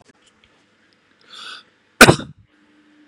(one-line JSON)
{"cough_length": "3.1 s", "cough_amplitude": 32768, "cough_signal_mean_std_ratio": 0.18, "survey_phase": "beta (2021-08-13 to 2022-03-07)", "age": "18-44", "gender": "Male", "wearing_mask": "No", "symptom_none": true, "smoker_status": "Ex-smoker", "respiratory_condition_asthma": false, "respiratory_condition_other": false, "recruitment_source": "REACT", "submission_delay": "3 days", "covid_test_result": "Negative", "covid_test_method": "RT-qPCR", "influenza_a_test_result": "Negative", "influenza_b_test_result": "Negative"}